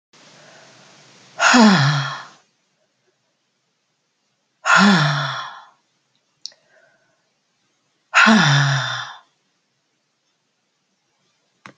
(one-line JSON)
{"exhalation_length": "11.8 s", "exhalation_amplitude": 29461, "exhalation_signal_mean_std_ratio": 0.36, "survey_phase": "beta (2021-08-13 to 2022-03-07)", "age": "45-64", "gender": "Female", "wearing_mask": "No", "symptom_cough_any": true, "symptom_sore_throat": true, "symptom_fatigue": true, "symptom_fever_high_temperature": true, "symptom_headache": true, "symptom_other": true, "smoker_status": "Never smoked", "respiratory_condition_asthma": false, "respiratory_condition_other": false, "recruitment_source": "Test and Trace", "submission_delay": "2 days", "covid_test_result": "Positive", "covid_test_method": "LFT"}